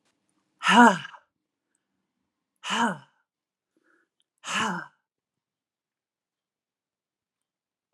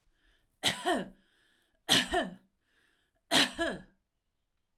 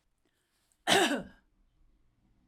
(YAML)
exhalation_length: 7.9 s
exhalation_amplitude: 28255
exhalation_signal_mean_std_ratio: 0.22
three_cough_length: 4.8 s
three_cough_amplitude: 9752
three_cough_signal_mean_std_ratio: 0.36
cough_length: 2.5 s
cough_amplitude: 9356
cough_signal_mean_std_ratio: 0.3
survey_phase: alpha (2021-03-01 to 2021-08-12)
age: 45-64
gender: Female
wearing_mask: 'No'
symptom_none: true
smoker_status: Ex-smoker
respiratory_condition_asthma: false
respiratory_condition_other: false
recruitment_source: REACT
submission_delay: 1 day
covid_test_result: Negative
covid_test_method: RT-qPCR